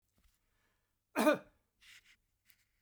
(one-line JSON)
{"cough_length": "2.8 s", "cough_amplitude": 4518, "cough_signal_mean_std_ratio": 0.22, "survey_phase": "beta (2021-08-13 to 2022-03-07)", "age": "65+", "gender": "Male", "wearing_mask": "No", "symptom_cough_any": true, "smoker_status": "Never smoked", "respiratory_condition_asthma": false, "respiratory_condition_other": false, "recruitment_source": "REACT", "submission_delay": "2 days", "covid_test_result": "Negative", "covid_test_method": "RT-qPCR", "influenza_a_test_result": "Negative", "influenza_b_test_result": "Negative"}